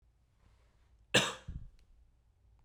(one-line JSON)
{"cough_length": "2.6 s", "cough_amplitude": 7578, "cough_signal_mean_std_ratio": 0.25, "survey_phase": "beta (2021-08-13 to 2022-03-07)", "age": "18-44", "gender": "Male", "wearing_mask": "No", "symptom_cough_any": true, "symptom_runny_or_blocked_nose": true, "symptom_fatigue": true, "smoker_status": "Never smoked", "recruitment_source": "Test and Trace", "submission_delay": "1 day", "covid_test_result": "Positive", "covid_test_method": "RT-qPCR", "covid_ct_value": 19.6, "covid_ct_gene": "ORF1ab gene", "covid_ct_mean": 20.1, "covid_viral_load": "260000 copies/ml", "covid_viral_load_category": "Low viral load (10K-1M copies/ml)"}